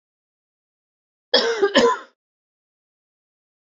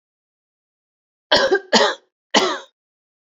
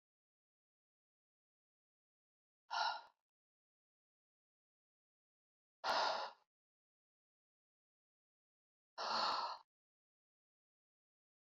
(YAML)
cough_length: 3.7 s
cough_amplitude: 26780
cough_signal_mean_std_ratio: 0.31
three_cough_length: 3.2 s
three_cough_amplitude: 32768
three_cough_signal_mean_std_ratio: 0.37
exhalation_length: 11.4 s
exhalation_amplitude: 1630
exhalation_signal_mean_std_ratio: 0.27
survey_phase: beta (2021-08-13 to 2022-03-07)
age: 45-64
gender: Female
wearing_mask: 'No'
symptom_cough_any: true
symptom_runny_or_blocked_nose: true
symptom_sore_throat: true
symptom_abdominal_pain: true
symptom_fatigue: true
symptom_headache: true
symptom_change_to_sense_of_smell_or_taste: true
symptom_onset: 3 days
smoker_status: Never smoked
respiratory_condition_asthma: false
respiratory_condition_other: false
recruitment_source: Test and Trace
submission_delay: 1 day
covid_test_result: Positive
covid_test_method: RT-qPCR
covid_ct_value: 16.3
covid_ct_gene: ORF1ab gene
covid_ct_mean: 16.5
covid_viral_load: 3800000 copies/ml
covid_viral_load_category: High viral load (>1M copies/ml)